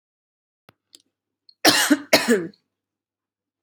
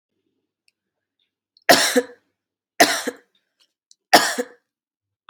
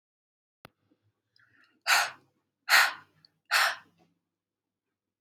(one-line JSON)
{"cough_length": "3.6 s", "cough_amplitude": 30546, "cough_signal_mean_std_ratio": 0.31, "three_cough_length": "5.3 s", "three_cough_amplitude": 32767, "three_cough_signal_mean_std_ratio": 0.27, "exhalation_length": "5.2 s", "exhalation_amplitude": 17236, "exhalation_signal_mean_std_ratio": 0.28, "survey_phase": "alpha (2021-03-01 to 2021-08-12)", "age": "18-44", "gender": "Female", "wearing_mask": "No", "symptom_cough_any": true, "symptom_shortness_of_breath": true, "symptom_fatigue": true, "symptom_headache": true, "symptom_change_to_sense_of_smell_or_taste": true, "symptom_onset": "3 days", "smoker_status": "Ex-smoker", "respiratory_condition_asthma": false, "respiratory_condition_other": false, "recruitment_source": "Test and Trace", "submission_delay": "2 days", "covid_test_result": "Positive", "covid_test_method": "RT-qPCR", "covid_ct_value": 18.8, "covid_ct_gene": "ORF1ab gene", "covid_ct_mean": 19.6, "covid_viral_load": "380000 copies/ml", "covid_viral_load_category": "Low viral load (10K-1M copies/ml)"}